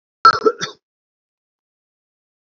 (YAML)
cough_length: 2.6 s
cough_amplitude: 32768
cough_signal_mean_std_ratio: 0.22
survey_phase: beta (2021-08-13 to 2022-03-07)
age: 45-64
gender: Male
wearing_mask: 'No'
symptom_fatigue: true
symptom_headache: true
symptom_change_to_sense_of_smell_or_taste: true
symptom_loss_of_taste: true
symptom_onset: 4 days
smoker_status: Never smoked
respiratory_condition_asthma: false
respiratory_condition_other: false
recruitment_source: Test and Trace
submission_delay: 2 days
covid_test_result: Positive
covid_test_method: RT-qPCR
covid_ct_value: 17.2
covid_ct_gene: ORF1ab gene
covid_ct_mean: 17.7
covid_viral_load: 1600000 copies/ml
covid_viral_load_category: High viral load (>1M copies/ml)